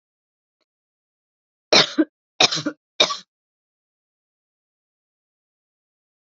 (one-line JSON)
{"three_cough_length": "6.3 s", "three_cough_amplitude": 32767, "three_cough_signal_mean_std_ratio": 0.21, "survey_phase": "beta (2021-08-13 to 2022-03-07)", "age": "18-44", "gender": "Female", "wearing_mask": "No", "symptom_cough_any": true, "symptom_sore_throat": true, "symptom_fatigue": true, "symptom_headache": true, "symptom_change_to_sense_of_smell_or_taste": true, "smoker_status": "Never smoked", "respiratory_condition_asthma": false, "respiratory_condition_other": false, "recruitment_source": "Test and Trace", "submission_delay": "2 days", "covid_test_result": "Positive", "covid_test_method": "RT-qPCR", "covid_ct_value": 31.3, "covid_ct_gene": "ORF1ab gene"}